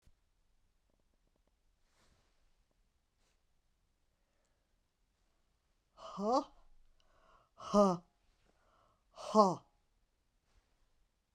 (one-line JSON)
{"exhalation_length": "11.3 s", "exhalation_amplitude": 6926, "exhalation_signal_mean_std_ratio": 0.21, "survey_phase": "beta (2021-08-13 to 2022-03-07)", "age": "65+", "gender": "Female", "wearing_mask": "No", "symptom_cough_any": true, "symptom_fever_high_temperature": true, "symptom_change_to_sense_of_smell_or_taste": true, "symptom_loss_of_taste": true, "smoker_status": "Ex-smoker", "respiratory_condition_asthma": false, "respiratory_condition_other": false, "recruitment_source": "Test and Trace", "submission_delay": "2 days", "covid_test_result": "Positive", "covid_test_method": "RT-qPCR"}